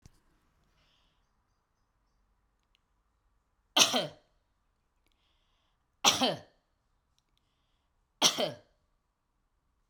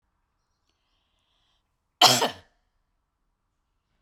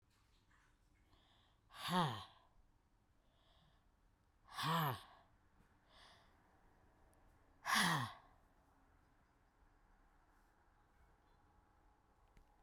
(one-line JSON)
{"three_cough_length": "9.9 s", "three_cough_amplitude": 16441, "three_cough_signal_mean_std_ratio": 0.21, "cough_length": "4.0 s", "cough_amplitude": 32768, "cough_signal_mean_std_ratio": 0.19, "exhalation_length": "12.6 s", "exhalation_amplitude": 2433, "exhalation_signal_mean_std_ratio": 0.29, "survey_phase": "beta (2021-08-13 to 2022-03-07)", "age": "45-64", "gender": "Female", "wearing_mask": "No", "symptom_none": true, "smoker_status": "Never smoked", "respiratory_condition_asthma": false, "respiratory_condition_other": false, "recruitment_source": "REACT", "submission_delay": "1 day", "covid_test_result": "Negative", "covid_test_method": "RT-qPCR"}